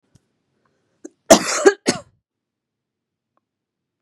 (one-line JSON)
{"cough_length": "4.0 s", "cough_amplitude": 32768, "cough_signal_mean_std_ratio": 0.21, "survey_phase": "beta (2021-08-13 to 2022-03-07)", "age": "18-44", "gender": "Female", "wearing_mask": "No", "symptom_runny_or_blocked_nose": true, "symptom_sore_throat": true, "symptom_fatigue": true, "symptom_headache": true, "symptom_other": true, "symptom_onset": "7 days", "smoker_status": "Never smoked", "respiratory_condition_asthma": false, "respiratory_condition_other": false, "recruitment_source": "Test and Trace", "submission_delay": "1 day", "covid_test_result": "Positive", "covid_test_method": "RT-qPCR", "covid_ct_value": 13.8, "covid_ct_gene": "ORF1ab gene", "covid_ct_mean": 14.1, "covid_viral_load": "25000000 copies/ml", "covid_viral_load_category": "High viral load (>1M copies/ml)"}